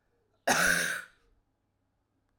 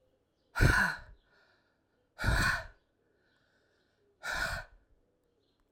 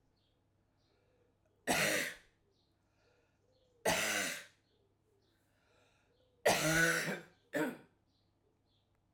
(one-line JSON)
{"cough_length": "2.4 s", "cough_amplitude": 8413, "cough_signal_mean_std_ratio": 0.38, "exhalation_length": "5.7 s", "exhalation_amplitude": 8346, "exhalation_signal_mean_std_ratio": 0.35, "three_cough_length": "9.1 s", "three_cough_amplitude": 4594, "three_cough_signal_mean_std_ratio": 0.37, "survey_phase": "alpha (2021-03-01 to 2021-08-12)", "age": "45-64", "gender": "Female", "wearing_mask": "No", "symptom_cough_any": true, "symptom_abdominal_pain": true, "symptom_fatigue": true, "symptom_fever_high_temperature": true, "symptom_headache": true, "symptom_onset": "3 days", "smoker_status": "Never smoked", "respiratory_condition_asthma": false, "respiratory_condition_other": false, "recruitment_source": "Test and Trace", "submission_delay": "2 days", "covid_test_result": "Positive", "covid_test_method": "RT-qPCR", "covid_ct_value": 12.4, "covid_ct_gene": "ORF1ab gene", "covid_ct_mean": 12.6, "covid_viral_load": "73000000 copies/ml", "covid_viral_load_category": "High viral load (>1M copies/ml)"}